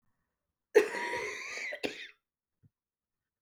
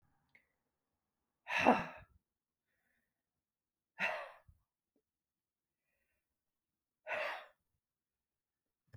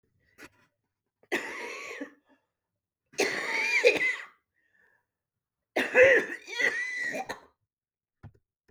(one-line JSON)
{"cough_length": "3.4 s", "cough_amplitude": 9517, "cough_signal_mean_std_ratio": 0.33, "exhalation_length": "9.0 s", "exhalation_amplitude": 7054, "exhalation_signal_mean_std_ratio": 0.22, "three_cough_length": "8.7 s", "three_cough_amplitude": 14442, "three_cough_signal_mean_std_ratio": 0.39, "survey_phase": "beta (2021-08-13 to 2022-03-07)", "age": "45-64", "gender": "Female", "wearing_mask": "No", "symptom_cough_any": true, "symptom_onset": "7 days", "smoker_status": "Never smoked", "respiratory_condition_asthma": true, "respiratory_condition_other": false, "recruitment_source": "REACT", "submission_delay": "0 days", "covid_test_result": "Negative", "covid_test_method": "RT-qPCR", "influenza_a_test_result": "Negative", "influenza_b_test_result": "Negative"}